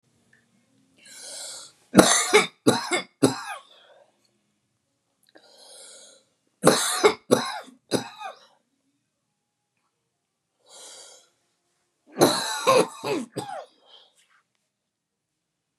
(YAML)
three_cough_length: 15.8 s
three_cough_amplitude: 32768
three_cough_signal_mean_std_ratio: 0.3
survey_phase: beta (2021-08-13 to 2022-03-07)
age: 45-64
gender: Female
wearing_mask: 'No'
symptom_cough_any: true
symptom_runny_or_blocked_nose: true
symptom_sore_throat: true
symptom_fatigue: true
symptom_headache: true
symptom_onset: 11 days
smoker_status: Never smoked
respiratory_condition_asthma: false
respiratory_condition_other: false
recruitment_source: REACT
submission_delay: 2 days
covid_test_result: Negative
covid_test_method: RT-qPCR
influenza_a_test_result: Negative
influenza_b_test_result: Negative